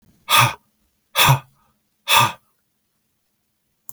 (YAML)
exhalation_length: 3.9 s
exhalation_amplitude: 32234
exhalation_signal_mean_std_ratio: 0.33
survey_phase: beta (2021-08-13 to 2022-03-07)
age: 65+
gender: Male
wearing_mask: 'No'
symptom_none: true
smoker_status: Never smoked
respiratory_condition_asthma: false
respiratory_condition_other: false
recruitment_source: REACT
submission_delay: 3 days
covid_test_result: Negative
covid_test_method: RT-qPCR
influenza_a_test_result: Negative
influenza_b_test_result: Negative